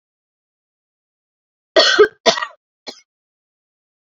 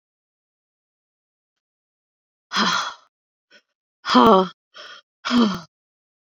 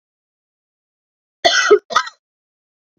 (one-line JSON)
{"three_cough_length": "4.2 s", "three_cough_amplitude": 29508, "three_cough_signal_mean_std_ratio": 0.25, "exhalation_length": "6.4 s", "exhalation_amplitude": 28765, "exhalation_signal_mean_std_ratio": 0.3, "cough_length": "3.0 s", "cough_amplitude": 29607, "cough_signal_mean_std_ratio": 0.29, "survey_phase": "beta (2021-08-13 to 2022-03-07)", "age": "45-64", "gender": "Female", "wearing_mask": "No", "symptom_runny_or_blocked_nose": true, "smoker_status": "Ex-smoker", "respiratory_condition_asthma": false, "respiratory_condition_other": false, "recruitment_source": "Test and Trace", "submission_delay": "2 days", "covid_test_result": "Positive", "covid_test_method": "ePCR"}